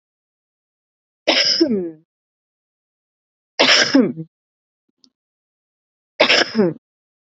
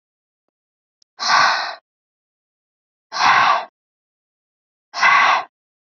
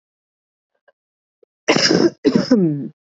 {"three_cough_length": "7.3 s", "three_cough_amplitude": 32768, "three_cough_signal_mean_std_ratio": 0.36, "exhalation_length": "5.8 s", "exhalation_amplitude": 26759, "exhalation_signal_mean_std_ratio": 0.4, "cough_length": "3.1 s", "cough_amplitude": 28055, "cough_signal_mean_std_ratio": 0.45, "survey_phase": "alpha (2021-03-01 to 2021-08-12)", "age": "18-44", "gender": "Female", "wearing_mask": "No", "symptom_cough_any": true, "symptom_fatigue": true, "symptom_headache": true, "smoker_status": "Ex-smoker", "respiratory_condition_asthma": false, "respiratory_condition_other": false, "recruitment_source": "Test and Trace", "submission_delay": "1 day", "covid_test_result": "Positive", "covid_test_method": "LFT"}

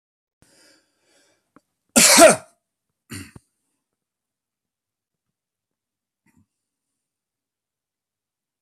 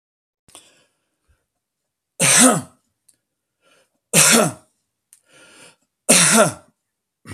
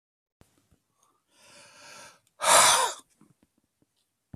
{"cough_length": "8.6 s", "cough_amplitude": 32768, "cough_signal_mean_std_ratio": 0.18, "three_cough_length": "7.3 s", "three_cough_amplitude": 32768, "three_cough_signal_mean_std_ratio": 0.33, "exhalation_length": "4.4 s", "exhalation_amplitude": 17440, "exhalation_signal_mean_std_ratio": 0.27, "survey_phase": "beta (2021-08-13 to 2022-03-07)", "age": "65+", "gender": "Male", "wearing_mask": "No", "symptom_none": true, "smoker_status": "Never smoked", "respiratory_condition_asthma": false, "respiratory_condition_other": false, "recruitment_source": "REACT", "submission_delay": "1 day", "covid_test_result": "Negative", "covid_test_method": "RT-qPCR"}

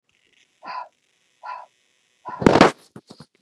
{"exhalation_length": "3.4 s", "exhalation_amplitude": 32768, "exhalation_signal_mean_std_ratio": 0.24, "survey_phase": "beta (2021-08-13 to 2022-03-07)", "age": "45-64", "gender": "Female", "wearing_mask": "No", "symptom_none": true, "smoker_status": "Never smoked", "respiratory_condition_asthma": false, "respiratory_condition_other": false, "recruitment_source": "REACT", "submission_delay": "1 day", "covid_test_result": "Negative", "covid_test_method": "RT-qPCR", "influenza_a_test_result": "Negative", "influenza_b_test_result": "Negative"}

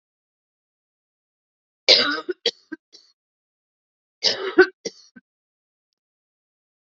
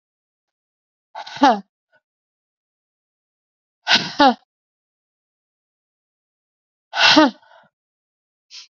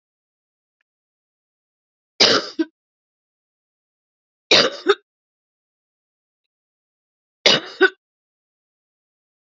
{"cough_length": "6.9 s", "cough_amplitude": 32767, "cough_signal_mean_std_ratio": 0.22, "exhalation_length": "8.7 s", "exhalation_amplitude": 32767, "exhalation_signal_mean_std_ratio": 0.25, "three_cough_length": "9.6 s", "three_cough_amplitude": 32768, "three_cough_signal_mean_std_ratio": 0.22, "survey_phase": "alpha (2021-03-01 to 2021-08-12)", "age": "45-64", "gender": "Female", "wearing_mask": "No", "symptom_cough_any": true, "symptom_shortness_of_breath": true, "symptom_fatigue": true, "symptom_headache": true, "symptom_change_to_sense_of_smell_or_taste": true, "symptom_onset": "3 days", "smoker_status": "Ex-smoker", "respiratory_condition_asthma": false, "respiratory_condition_other": false, "recruitment_source": "Test and Trace", "submission_delay": "1 day", "covid_test_result": "Positive", "covid_test_method": "RT-qPCR"}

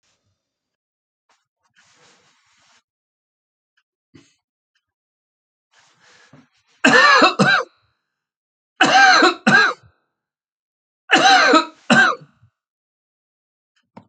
{"cough_length": "14.1 s", "cough_amplitude": 32623, "cough_signal_mean_std_ratio": 0.33, "survey_phase": "alpha (2021-03-01 to 2021-08-12)", "age": "65+", "gender": "Male", "wearing_mask": "No", "symptom_none": true, "smoker_status": "Never smoked", "respiratory_condition_asthma": false, "respiratory_condition_other": false, "recruitment_source": "REACT", "submission_delay": "1 day", "covid_test_result": "Negative", "covid_test_method": "RT-qPCR"}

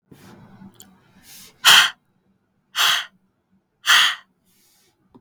{"exhalation_length": "5.2 s", "exhalation_amplitude": 32768, "exhalation_signal_mean_std_ratio": 0.31, "survey_phase": "beta (2021-08-13 to 2022-03-07)", "age": "18-44", "gender": "Female", "wearing_mask": "No", "symptom_none": true, "smoker_status": "Never smoked", "respiratory_condition_asthma": true, "respiratory_condition_other": false, "recruitment_source": "REACT", "submission_delay": "1 day", "covid_test_result": "Negative", "covid_test_method": "RT-qPCR", "influenza_a_test_result": "Unknown/Void", "influenza_b_test_result": "Unknown/Void"}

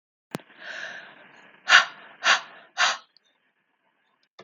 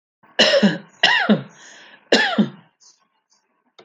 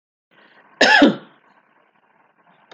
{"exhalation_length": "4.4 s", "exhalation_amplitude": 31224, "exhalation_signal_mean_std_ratio": 0.29, "three_cough_length": "3.8 s", "three_cough_amplitude": 30475, "three_cough_signal_mean_std_ratio": 0.44, "cough_length": "2.7 s", "cough_amplitude": 28137, "cough_signal_mean_std_ratio": 0.3, "survey_phase": "alpha (2021-03-01 to 2021-08-12)", "age": "45-64", "gender": "Female", "wearing_mask": "No", "symptom_none": true, "smoker_status": "Never smoked", "respiratory_condition_asthma": false, "respiratory_condition_other": false, "recruitment_source": "REACT", "submission_delay": "4 days", "covid_test_result": "Negative", "covid_test_method": "RT-qPCR"}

